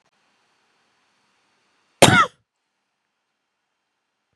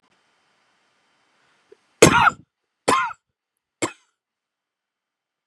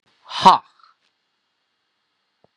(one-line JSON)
{"cough_length": "4.4 s", "cough_amplitude": 32768, "cough_signal_mean_std_ratio": 0.18, "three_cough_length": "5.5 s", "three_cough_amplitude": 32768, "three_cough_signal_mean_std_ratio": 0.23, "exhalation_length": "2.6 s", "exhalation_amplitude": 32768, "exhalation_signal_mean_std_ratio": 0.19, "survey_phase": "beta (2021-08-13 to 2022-03-07)", "age": "18-44", "gender": "Male", "wearing_mask": "No", "symptom_cough_any": true, "symptom_onset": "4 days", "smoker_status": "Never smoked", "respiratory_condition_asthma": false, "respiratory_condition_other": false, "recruitment_source": "Test and Trace", "submission_delay": "2 days", "covid_test_result": "Negative", "covid_test_method": "RT-qPCR"}